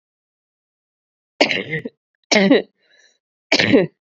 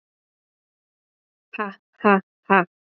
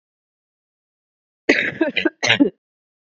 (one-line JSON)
{"three_cough_length": "4.1 s", "three_cough_amplitude": 32768, "three_cough_signal_mean_std_ratio": 0.36, "exhalation_length": "3.0 s", "exhalation_amplitude": 27767, "exhalation_signal_mean_std_ratio": 0.24, "cough_length": "3.2 s", "cough_amplitude": 31216, "cough_signal_mean_std_ratio": 0.34, "survey_phase": "beta (2021-08-13 to 2022-03-07)", "age": "18-44", "gender": "Female", "wearing_mask": "No", "symptom_cough_any": true, "symptom_new_continuous_cough": true, "symptom_runny_or_blocked_nose": true, "symptom_diarrhoea": true, "symptom_fever_high_temperature": true, "symptom_headache": true, "symptom_onset": "3 days", "smoker_status": "Never smoked", "respiratory_condition_asthma": false, "respiratory_condition_other": false, "recruitment_source": "Test and Trace", "submission_delay": "2 days", "covid_test_result": "Positive", "covid_test_method": "RT-qPCR", "covid_ct_value": 15.9, "covid_ct_gene": "ORF1ab gene", "covid_ct_mean": 16.1, "covid_viral_load": "5400000 copies/ml", "covid_viral_load_category": "High viral load (>1M copies/ml)"}